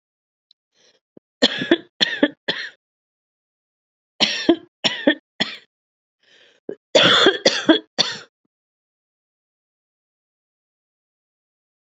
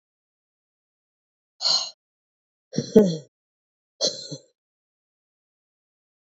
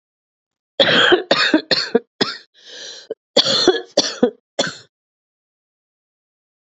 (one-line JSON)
{"three_cough_length": "11.9 s", "three_cough_amplitude": 32767, "three_cough_signal_mean_std_ratio": 0.29, "exhalation_length": "6.4 s", "exhalation_amplitude": 27643, "exhalation_signal_mean_std_ratio": 0.23, "cough_length": "6.7 s", "cough_amplitude": 32768, "cough_signal_mean_std_ratio": 0.41, "survey_phase": "beta (2021-08-13 to 2022-03-07)", "age": "45-64", "gender": "Female", "wearing_mask": "No", "symptom_cough_any": true, "symptom_runny_or_blocked_nose": true, "symptom_sore_throat": true, "symptom_diarrhoea": true, "symptom_fatigue": true, "symptom_headache": true, "symptom_onset": "3 days", "smoker_status": "Never smoked", "respiratory_condition_asthma": true, "respiratory_condition_other": false, "recruitment_source": "Test and Trace", "submission_delay": "2 days", "covid_test_result": "Positive", "covid_test_method": "ePCR"}